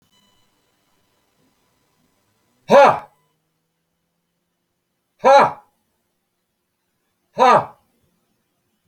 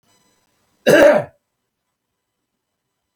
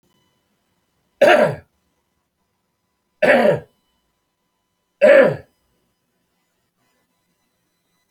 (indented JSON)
{
  "exhalation_length": "8.9 s",
  "exhalation_amplitude": 29133,
  "exhalation_signal_mean_std_ratio": 0.24,
  "cough_length": "3.2 s",
  "cough_amplitude": 31578,
  "cough_signal_mean_std_ratio": 0.28,
  "three_cough_length": "8.1 s",
  "three_cough_amplitude": 28895,
  "three_cough_signal_mean_std_ratio": 0.29,
  "survey_phase": "alpha (2021-03-01 to 2021-08-12)",
  "age": "65+",
  "gender": "Male",
  "wearing_mask": "No",
  "symptom_none": true,
  "smoker_status": "Ex-smoker",
  "respiratory_condition_asthma": false,
  "respiratory_condition_other": false,
  "recruitment_source": "REACT",
  "submission_delay": "2 days",
  "covid_test_result": "Negative",
  "covid_test_method": "RT-qPCR"
}